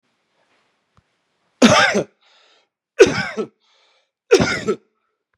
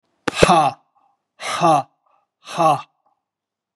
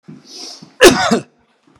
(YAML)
three_cough_length: 5.4 s
three_cough_amplitude: 32768
three_cough_signal_mean_std_ratio: 0.32
exhalation_length: 3.8 s
exhalation_amplitude: 32768
exhalation_signal_mean_std_ratio: 0.39
cough_length: 1.8 s
cough_amplitude: 32768
cough_signal_mean_std_ratio: 0.37
survey_phase: beta (2021-08-13 to 2022-03-07)
age: 45-64
gender: Male
wearing_mask: 'No'
symptom_none: true
smoker_status: Never smoked
respiratory_condition_asthma: false
respiratory_condition_other: false
recruitment_source: REACT
submission_delay: 2 days
covid_test_result: Negative
covid_test_method: RT-qPCR